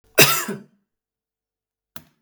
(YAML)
cough_length: 2.2 s
cough_amplitude: 32768
cough_signal_mean_std_ratio: 0.26
survey_phase: beta (2021-08-13 to 2022-03-07)
age: 65+
gender: Male
wearing_mask: 'No'
symptom_runny_or_blocked_nose: true
smoker_status: Ex-smoker
respiratory_condition_asthma: false
respiratory_condition_other: false
recruitment_source: REACT
submission_delay: 2 days
covid_test_result: Negative
covid_test_method: RT-qPCR
influenza_a_test_result: Negative
influenza_b_test_result: Negative